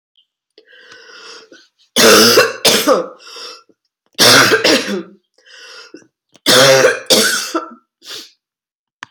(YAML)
three_cough_length: 9.1 s
three_cough_amplitude: 32768
three_cough_signal_mean_std_ratio: 0.47
survey_phase: beta (2021-08-13 to 2022-03-07)
age: 65+
gender: Female
wearing_mask: 'No'
symptom_cough_any: true
symptom_onset: 3 days
smoker_status: Ex-smoker
respiratory_condition_asthma: false
respiratory_condition_other: false
recruitment_source: Test and Trace
submission_delay: 2 days
covid_test_result: Positive
covid_test_method: RT-qPCR
covid_ct_value: 15.5
covid_ct_gene: ORF1ab gene
covid_ct_mean: 15.7
covid_viral_load: 6900000 copies/ml
covid_viral_load_category: High viral load (>1M copies/ml)